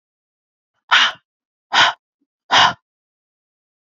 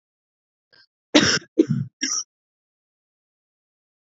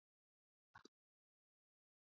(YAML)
exhalation_length: 3.9 s
exhalation_amplitude: 30683
exhalation_signal_mean_std_ratio: 0.31
three_cough_length: 4.0 s
three_cough_amplitude: 29588
three_cough_signal_mean_std_ratio: 0.28
cough_length: 2.1 s
cough_amplitude: 141
cough_signal_mean_std_ratio: 0.13
survey_phase: beta (2021-08-13 to 2022-03-07)
age: 18-44
gender: Female
wearing_mask: 'No'
symptom_cough_any: true
symptom_runny_or_blocked_nose: true
symptom_sore_throat: true
symptom_fatigue: true
symptom_headache: true
symptom_change_to_sense_of_smell_or_taste: true
symptom_onset: 3 days
smoker_status: Ex-smoker
respiratory_condition_asthma: false
respiratory_condition_other: false
recruitment_source: Test and Trace
submission_delay: 2 days
covid_test_result: Positive
covid_test_method: RT-qPCR
covid_ct_value: 27.9
covid_ct_gene: ORF1ab gene